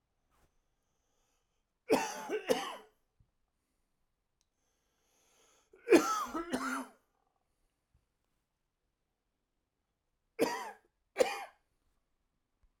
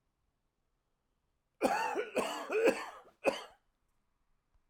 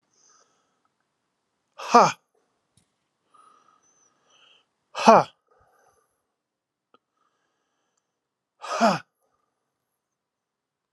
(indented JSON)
{
  "three_cough_length": "12.8 s",
  "three_cough_amplitude": 10487,
  "three_cough_signal_mean_std_ratio": 0.26,
  "cough_length": "4.7 s",
  "cough_amplitude": 5360,
  "cough_signal_mean_std_ratio": 0.4,
  "exhalation_length": "10.9 s",
  "exhalation_amplitude": 30837,
  "exhalation_signal_mean_std_ratio": 0.17,
  "survey_phase": "alpha (2021-03-01 to 2021-08-12)",
  "age": "45-64",
  "gender": "Male",
  "wearing_mask": "No",
  "symptom_cough_any": true,
  "symptom_fatigue": true,
  "symptom_fever_high_temperature": true,
  "symptom_headache": true,
  "smoker_status": "Never smoked",
  "respiratory_condition_asthma": false,
  "respiratory_condition_other": false,
  "recruitment_source": "Test and Trace",
  "submission_delay": "1 day",
  "covid_test_result": "Positive",
  "covid_test_method": "LFT"
}